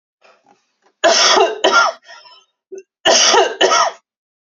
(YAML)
cough_length: 4.5 s
cough_amplitude: 32768
cough_signal_mean_std_ratio: 0.52
survey_phase: beta (2021-08-13 to 2022-03-07)
age: 18-44
gender: Female
wearing_mask: 'No'
symptom_runny_or_blocked_nose: true
smoker_status: Ex-smoker
respiratory_condition_asthma: false
respiratory_condition_other: false
recruitment_source: REACT
submission_delay: 1 day
covid_test_result: Negative
covid_test_method: RT-qPCR
influenza_a_test_result: Negative
influenza_b_test_result: Negative